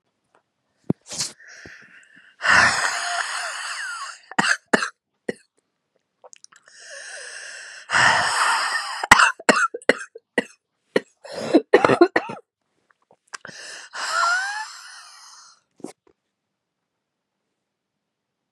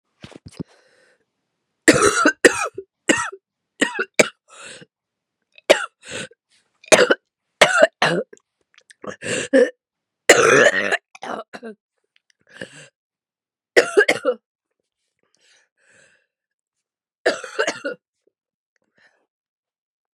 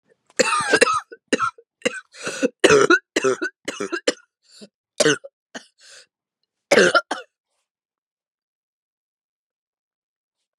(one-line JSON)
{"exhalation_length": "18.5 s", "exhalation_amplitude": 32768, "exhalation_signal_mean_std_ratio": 0.37, "three_cough_length": "20.1 s", "three_cough_amplitude": 32768, "three_cough_signal_mean_std_ratio": 0.31, "cough_length": "10.6 s", "cough_amplitude": 32768, "cough_signal_mean_std_ratio": 0.34, "survey_phase": "beta (2021-08-13 to 2022-03-07)", "age": "18-44", "gender": "Female", "wearing_mask": "No", "symptom_cough_any": true, "symptom_sore_throat": true, "symptom_fatigue": true, "symptom_headache": true, "symptom_change_to_sense_of_smell_or_taste": true, "symptom_other": true, "symptom_onset": "3 days", "smoker_status": "Ex-smoker", "respiratory_condition_asthma": true, "respiratory_condition_other": false, "recruitment_source": "Test and Trace", "submission_delay": "1 day", "covid_test_result": "Positive", "covid_test_method": "ePCR"}